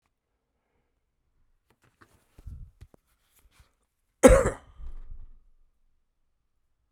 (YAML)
cough_length: 6.9 s
cough_amplitude: 31936
cough_signal_mean_std_ratio: 0.18
survey_phase: beta (2021-08-13 to 2022-03-07)
age: 45-64
gender: Male
wearing_mask: 'No'
symptom_cough_any: true
symptom_sore_throat: true
symptom_fatigue: true
symptom_headache: true
smoker_status: Ex-smoker
respiratory_condition_asthma: false
respiratory_condition_other: false
recruitment_source: Test and Trace
submission_delay: 2 days
covid_test_result: Positive
covid_test_method: RT-qPCR
covid_ct_value: 20.7
covid_ct_gene: ORF1ab gene
covid_ct_mean: 21.3
covid_viral_load: 100000 copies/ml
covid_viral_load_category: Low viral load (10K-1M copies/ml)